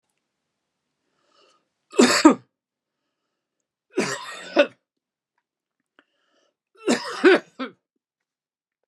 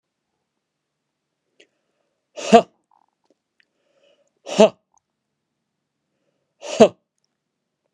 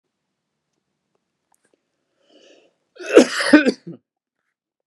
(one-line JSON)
{"three_cough_length": "8.9 s", "three_cough_amplitude": 32063, "three_cough_signal_mean_std_ratio": 0.25, "exhalation_length": "7.9 s", "exhalation_amplitude": 32768, "exhalation_signal_mean_std_ratio": 0.16, "cough_length": "4.9 s", "cough_amplitude": 32768, "cough_signal_mean_std_ratio": 0.22, "survey_phase": "beta (2021-08-13 to 2022-03-07)", "age": "45-64", "gender": "Male", "wearing_mask": "No", "symptom_none": true, "smoker_status": "Never smoked", "respiratory_condition_asthma": false, "respiratory_condition_other": false, "recruitment_source": "REACT", "submission_delay": "1 day", "covid_test_result": "Negative", "covid_test_method": "RT-qPCR"}